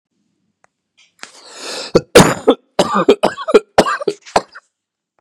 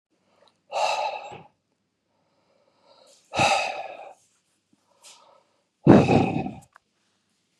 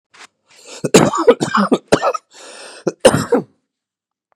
{"three_cough_length": "5.2 s", "three_cough_amplitude": 32768, "three_cough_signal_mean_std_ratio": 0.35, "exhalation_length": "7.6 s", "exhalation_amplitude": 29796, "exhalation_signal_mean_std_ratio": 0.31, "cough_length": "4.4 s", "cough_amplitude": 32768, "cough_signal_mean_std_ratio": 0.41, "survey_phase": "beta (2021-08-13 to 2022-03-07)", "age": "45-64", "gender": "Male", "wearing_mask": "No", "symptom_cough_any": true, "symptom_fatigue": true, "symptom_headache": true, "symptom_onset": "3 days", "smoker_status": "Never smoked", "respiratory_condition_asthma": false, "respiratory_condition_other": false, "recruitment_source": "Test and Trace", "submission_delay": "1 day", "covid_test_result": "Positive", "covid_test_method": "RT-qPCR", "covid_ct_value": 22.8, "covid_ct_gene": "N gene"}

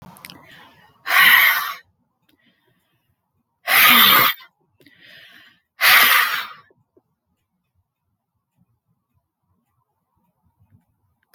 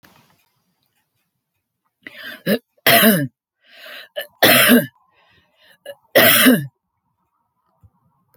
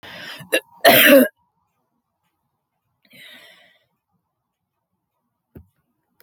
{"exhalation_length": "11.3 s", "exhalation_amplitude": 32632, "exhalation_signal_mean_std_ratio": 0.33, "three_cough_length": "8.4 s", "three_cough_amplitude": 32768, "three_cough_signal_mean_std_ratio": 0.35, "cough_length": "6.2 s", "cough_amplitude": 32035, "cough_signal_mean_std_ratio": 0.24, "survey_phase": "alpha (2021-03-01 to 2021-08-12)", "age": "65+", "gender": "Female", "wearing_mask": "No", "symptom_none": true, "smoker_status": "Never smoked", "respiratory_condition_asthma": false, "respiratory_condition_other": false, "recruitment_source": "REACT", "submission_delay": "3 days", "covid_test_result": "Negative", "covid_test_method": "RT-qPCR"}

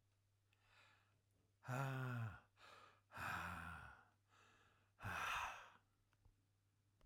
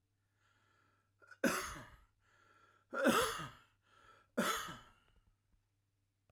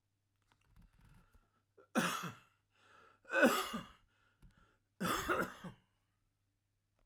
{"exhalation_length": "7.1 s", "exhalation_amplitude": 867, "exhalation_signal_mean_std_ratio": 0.51, "cough_length": "6.3 s", "cough_amplitude": 4829, "cough_signal_mean_std_ratio": 0.34, "three_cough_length": "7.1 s", "three_cough_amplitude": 4778, "three_cough_signal_mean_std_ratio": 0.33, "survey_phase": "alpha (2021-03-01 to 2021-08-12)", "age": "65+", "gender": "Male", "wearing_mask": "No", "symptom_none": true, "smoker_status": "Never smoked", "respiratory_condition_asthma": false, "respiratory_condition_other": false, "recruitment_source": "REACT", "submission_delay": "1 day", "covid_test_result": "Negative", "covid_test_method": "RT-qPCR"}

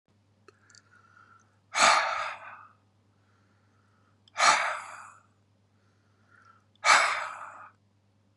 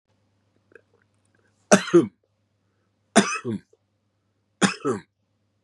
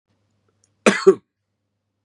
{"exhalation_length": "8.4 s", "exhalation_amplitude": 17929, "exhalation_signal_mean_std_ratio": 0.33, "three_cough_length": "5.6 s", "three_cough_amplitude": 32676, "three_cough_signal_mean_std_ratio": 0.26, "cough_length": "2.0 s", "cough_amplitude": 32624, "cough_signal_mean_std_ratio": 0.23, "survey_phase": "beta (2021-08-13 to 2022-03-07)", "age": "45-64", "gender": "Male", "wearing_mask": "No", "symptom_none": true, "smoker_status": "Current smoker (11 or more cigarettes per day)", "respiratory_condition_asthma": false, "respiratory_condition_other": false, "recruitment_source": "REACT", "submission_delay": "1 day", "covid_test_result": "Negative", "covid_test_method": "RT-qPCR", "influenza_a_test_result": "Unknown/Void", "influenza_b_test_result": "Unknown/Void"}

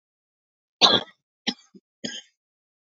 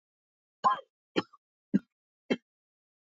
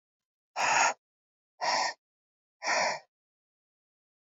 {"three_cough_length": "2.9 s", "three_cough_amplitude": 28650, "three_cough_signal_mean_std_ratio": 0.23, "cough_length": "3.2 s", "cough_amplitude": 7505, "cough_signal_mean_std_ratio": 0.22, "exhalation_length": "4.4 s", "exhalation_amplitude": 7673, "exhalation_signal_mean_std_ratio": 0.39, "survey_phase": "beta (2021-08-13 to 2022-03-07)", "age": "18-44", "gender": "Female", "wearing_mask": "No", "symptom_cough_any": true, "symptom_shortness_of_breath": true, "symptom_sore_throat": true, "symptom_fatigue": true, "symptom_headache": true, "symptom_change_to_sense_of_smell_or_taste": true, "symptom_onset": "3 days", "smoker_status": "Ex-smoker", "respiratory_condition_asthma": false, "respiratory_condition_other": false, "recruitment_source": "Test and Trace", "submission_delay": "2 days", "covid_test_result": "Positive", "covid_test_method": "RT-qPCR", "covid_ct_value": 20.4, "covid_ct_gene": "ORF1ab gene", "covid_ct_mean": 20.9, "covid_viral_load": "140000 copies/ml", "covid_viral_load_category": "Low viral load (10K-1M copies/ml)"}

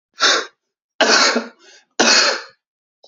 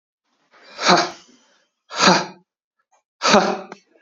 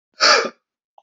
{"three_cough_length": "3.1 s", "three_cough_amplitude": 32768, "three_cough_signal_mean_std_ratio": 0.5, "exhalation_length": "4.0 s", "exhalation_amplitude": 32768, "exhalation_signal_mean_std_ratio": 0.37, "cough_length": "1.0 s", "cough_amplitude": 29596, "cough_signal_mean_std_ratio": 0.41, "survey_phase": "beta (2021-08-13 to 2022-03-07)", "age": "18-44", "gender": "Male", "wearing_mask": "No", "symptom_none": true, "symptom_onset": "13 days", "smoker_status": "Never smoked", "respiratory_condition_asthma": false, "respiratory_condition_other": false, "recruitment_source": "REACT", "submission_delay": "1 day", "covid_test_result": "Negative", "covid_test_method": "RT-qPCR", "influenza_a_test_result": "Negative", "influenza_b_test_result": "Negative"}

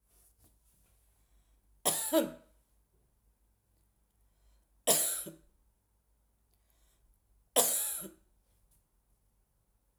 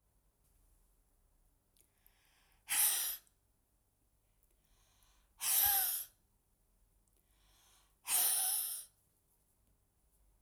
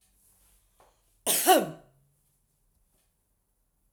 {"three_cough_length": "10.0 s", "three_cough_amplitude": 11023, "three_cough_signal_mean_std_ratio": 0.28, "exhalation_length": "10.4 s", "exhalation_amplitude": 3830, "exhalation_signal_mean_std_ratio": 0.35, "cough_length": "3.9 s", "cough_amplitude": 16326, "cough_signal_mean_std_ratio": 0.24, "survey_phase": "alpha (2021-03-01 to 2021-08-12)", "age": "65+", "gender": "Female", "wearing_mask": "No", "symptom_none": true, "smoker_status": "Ex-smoker", "respiratory_condition_asthma": true, "respiratory_condition_other": false, "recruitment_source": "REACT", "submission_delay": "2 days", "covid_test_result": "Negative", "covid_test_method": "RT-qPCR"}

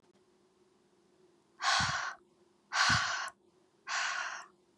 {"exhalation_length": "4.8 s", "exhalation_amplitude": 5709, "exhalation_signal_mean_std_ratio": 0.47, "survey_phase": "beta (2021-08-13 to 2022-03-07)", "age": "18-44", "gender": "Female", "wearing_mask": "No", "symptom_cough_any": true, "symptom_onset": "4 days", "smoker_status": "Never smoked", "respiratory_condition_asthma": false, "respiratory_condition_other": false, "recruitment_source": "REACT", "submission_delay": "1 day", "covid_test_result": "Negative", "covid_test_method": "RT-qPCR", "influenza_a_test_result": "Negative", "influenza_b_test_result": "Negative"}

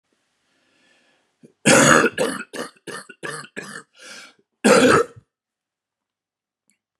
{"cough_length": "7.0 s", "cough_amplitude": 32767, "cough_signal_mean_std_ratio": 0.34, "survey_phase": "beta (2021-08-13 to 2022-03-07)", "age": "65+", "gender": "Male", "wearing_mask": "No", "symptom_cough_any": true, "symptom_runny_or_blocked_nose": true, "symptom_diarrhoea": true, "symptom_fatigue": true, "symptom_headache": true, "smoker_status": "Ex-smoker", "respiratory_condition_asthma": false, "respiratory_condition_other": false, "recruitment_source": "Test and Trace", "submission_delay": "1 day", "covid_test_result": "Positive", "covid_test_method": "RT-qPCR", "covid_ct_value": 23.2, "covid_ct_gene": "ORF1ab gene", "covid_ct_mean": 24.0, "covid_viral_load": "14000 copies/ml", "covid_viral_load_category": "Low viral load (10K-1M copies/ml)"}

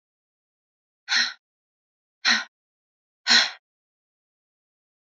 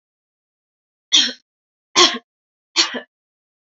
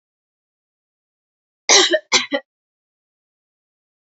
{"exhalation_length": "5.1 s", "exhalation_amplitude": 19734, "exhalation_signal_mean_std_ratio": 0.26, "three_cough_length": "3.8 s", "three_cough_amplitude": 32149, "three_cough_signal_mean_std_ratio": 0.28, "cough_length": "4.1 s", "cough_amplitude": 32768, "cough_signal_mean_std_ratio": 0.25, "survey_phase": "alpha (2021-03-01 to 2021-08-12)", "age": "18-44", "gender": "Female", "wearing_mask": "No", "symptom_fatigue": true, "smoker_status": "Never smoked", "respiratory_condition_asthma": false, "respiratory_condition_other": false, "recruitment_source": "Test and Trace", "submission_delay": "2 days", "covid_test_result": "Positive", "covid_test_method": "RT-qPCR"}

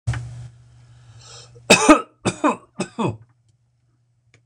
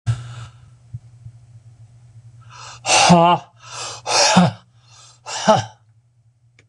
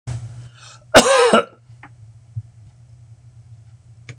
{"three_cough_length": "4.5 s", "three_cough_amplitude": 26028, "three_cough_signal_mean_std_ratio": 0.32, "exhalation_length": "6.7 s", "exhalation_amplitude": 26028, "exhalation_signal_mean_std_ratio": 0.41, "cough_length": "4.2 s", "cough_amplitude": 26028, "cough_signal_mean_std_ratio": 0.34, "survey_phase": "beta (2021-08-13 to 2022-03-07)", "age": "65+", "gender": "Male", "wearing_mask": "No", "symptom_none": true, "smoker_status": "Never smoked", "respiratory_condition_asthma": true, "respiratory_condition_other": false, "recruitment_source": "REACT", "submission_delay": "2 days", "covid_test_result": "Negative", "covid_test_method": "RT-qPCR", "influenza_a_test_result": "Negative", "influenza_b_test_result": "Negative"}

